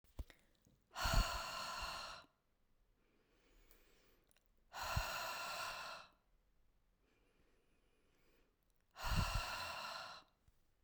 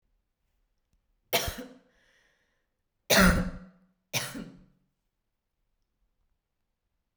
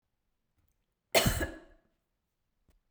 {
  "exhalation_length": "10.8 s",
  "exhalation_amplitude": 2340,
  "exhalation_signal_mean_std_ratio": 0.44,
  "three_cough_length": "7.2 s",
  "three_cough_amplitude": 12340,
  "three_cough_signal_mean_std_ratio": 0.25,
  "cough_length": "2.9 s",
  "cough_amplitude": 9586,
  "cough_signal_mean_std_ratio": 0.26,
  "survey_phase": "beta (2021-08-13 to 2022-03-07)",
  "age": "18-44",
  "gender": "Female",
  "wearing_mask": "No",
  "symptom_none": true,
  "smoker_status": "Never smoked",
  "respiratory_condition_asthma": false,
  "respiratory_condition_other": false,
  "recruitment_source": "REACT",
  "submission_delay": "2 days",
  "covid_test_result": "Negative",
  "covid_test_method": "RT-qPCR"
}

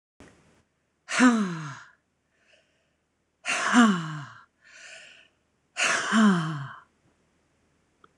{
  "exhalation_length": "8.2 s",
  "exhalation_amplitude": 16199,
  "exhalation_signal_mean_std_ratio": 0.39,
  "survey_phase": "beta (2021-08-13 to 2022-03-07)",
  "age": "45-64",
  "gender": "Female",
  "wearing_mask": "No",
  "symptom_none": true,
  "smoker_status": "Ex-smoker",
  "respiratory_condition_asthma": false,
  "respiratory_condition_other": false,
  "recruitment_source": "REACT",
  "submission_delay": "1 day",
  "covid_test_result": "Negative",
  "covid_test_method": "RT-qPCR",
  "influenza_a_test_result": "Negative",
  "influenza_b_test_result": "Negative"
}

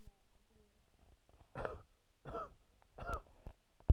{
  "three_cough_length": "3.9 s",
  "three_cough_amplitude": 4615,
  "three_cough_signal_mean_std_ratio": 0.22,
  "survey_phase": "alpha (2021-03-01 to 2021-08-12)",
  "age": "18-44",
  "gender": "Male",
  "wearing_mask": "Yes",
  "symptom_cough_any": true,
  "symptom_new_continuous_cough": true,
  "symptom_fever_high_temperature": true,
  "symptom_headache": true,
  "symptom_change_to_sense_of_smell_or_taste": true,
  "symptom_loss_of_taste": true,
  "symptom_onset": "2 days",
  "smoker_status": "Current smoker (1 to 10 cigarettes per day)",
  "respiratory_condition_asthma": false,
  "respiratory_condition_other": false,
  "recruitment_source": "Test and Trace",
  "submission_delay": "2 days",
  "covid_test_result": "Positive",
  "covid_test_method": "RT-qPCR",
  "covid_ct_value": 15.4,
  "covid_ct_gene": "ORF1ab gene",
  "covid_ct_mean": 15.7,
  "covid_viral_load": "6900000 copies/ml",
  "covid_viral_load_category": "High viral load (>1M copies/ml)"
}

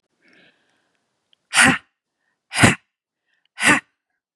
{
  "exhalation_length": "4.4 s",
  "exhalation_amplitude": 32767,
  "exhalation_signal_mean_std_ratio": 0.28,
  "survey_phase": "beta (2021-08-13 to 2022-03-07)",
  "age": "18-44",
  "gender": "Female",
  "wearing_mask": "No",
  "symptom_none": true,
  "smoker_status": "Ex-smoker",
  "respiratory_condition_asthma": false,
  "respiratory_condition_other": false,
  "recruitment_source": "REACT",
  "submission_delay": "0 days",
  "covid_test_result": "Negative",
  "covid_test_method": "RT-qPCR",
  "covid_ct_value": 37.5,
  "covid_ct_gene": "N gene",
  "influenza_a_test_result": "Negative",
  "influenza_b_test_result": "Negative"
}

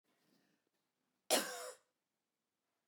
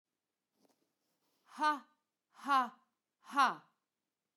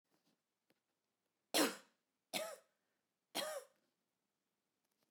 {
  "cough_length": "2.9 s",
  "cough_amplitude": 3417,
  "cough_signal_mean_std_ratio": 0.23,
  "exhalation_length": "4.4 s",
  "exhalation_amplitude": 4815,
  "exhalation_signal_mean_std_ratio": 0.27,
  "three_cough_length": "5.1 s",
  "three_cough_amplitude": 2931,
  "three_cough_signal_mean_std_ratio": 0.25,
  "survey_phase": "beta (2021-08-13 to 2022-03-07)",
  "age": "45-64",
  "gender": "Female",
  "wearing_mask": "No",
  "symptom_none": true,
  "smoker_status": "Never smoked",
  "respiratory_condition_asthma": false,
  "respiratory_condition_other": false,
  "recruitment_source": "REACT",
  "submission_delay": "2 days",
  "covid_test_result": "Negative",
  "covid_test_method": "RT-qPCR"
}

